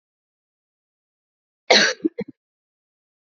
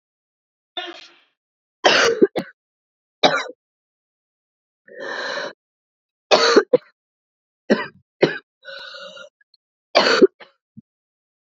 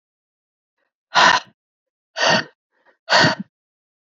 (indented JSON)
{
  "cough_length": "3.2 s",
  "cough_amplitude": 30069,
  "cough_signal_mean_std_ratio": 0.23,
  "three_cough_length": "11.4 s",
  "three_cough_amplitude": 31293,
  "three_cough_signal_mean_std_ratio": 0.31,
  "exhalation_length": "4.0 s",
  "exhalation_amplitude": 28174,
  "exhalation_signal_mean_std_ratio": 0.34,
  "survey_phase": "beta (2021-08-13 to 2022-03-07)",
  "age": "18-44",
  "gender": "Female",
  "wearing_mask": "No",
  "symptom_cough_any": true,
  "symptom_runny_or_blocked_nose": true,
  "symptom_sore_throat": true,
  "symptom_change_to_sense_of_smell_or_taste": true,
  "symptom_loss_of_taste": true,
  "smoker_status": "Never smoked",
  "respiratory_condition_asthma": false,
  "respiratory_condition_other": false,
  "recruitment_source": "Test and Trace",
  "submission_delay": "1 day",
  "covid_test_result": "Positive",
  "covid_test_method": "RT-qPCR",
  "covid_ct_value": 18.6,
  "covid_ct_gene": "ORF1ab gene",
  "covid_ct_mean": 19.2,
  "covid_viral_load": "520000 copies/ml",
  "covid_viral_load_category": "Low viral load (10K-1M copies/ml)"
}